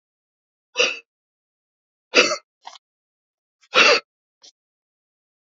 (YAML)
exhalation_length: 5.5 s
exhalation_amplitude: 30084
exhalation_signal_mean_std_ratio: 0.25
survey_phase: beta (2021-08-13 to 2022-03-07)
age: 65+
gender: Male
wearing_mask: 'No'
symptom_cough_any: true
symptom_headache: true
symptom_loss_of_taste: true
symptom_onset: 6 days
smoker_status: Ex-smoker
respiratory_condition_asthma: true
respiratory_condition_other: false
recruitment_source: Test and Trace
submission_delay: 2 days
covid_test_result: Positive
covid_test_method: ePCR